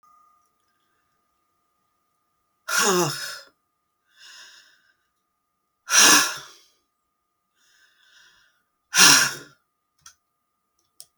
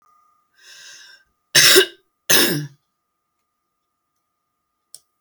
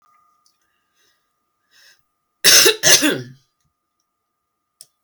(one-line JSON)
{"exhalation_length": "11.2 s", "exhalation_amplitude": 32768, "exhalation_signal_mean_std_ratio": 0.26, "cough_length": "5.2 s", "cough_amplitude": 32768, "cough_signal_mean_std_ratio": 0.28, "three_cough_length": "5.0 s", "three_cough_amplitude": 32768, "three_cough_signal_mean_std_ratio": 0.28, "survey_phase": "beta (2021-08-13 to 2022-03-07)", "age": "65+", "gender": "Female", "wearing_mask": "No", "symptom_none": true, "smoker_status": "Never smoked", "respiratory_condition_asthma": false, "respiratory_condition_other": false, "recruitment_source": "REACT", "submission_delay": "2 days", "covid_test_result": "Negative", "covid_test_method": "RT-qPCR", "influenza_a_test_result": "Negative", "influenza_b_test_result": "Negative"}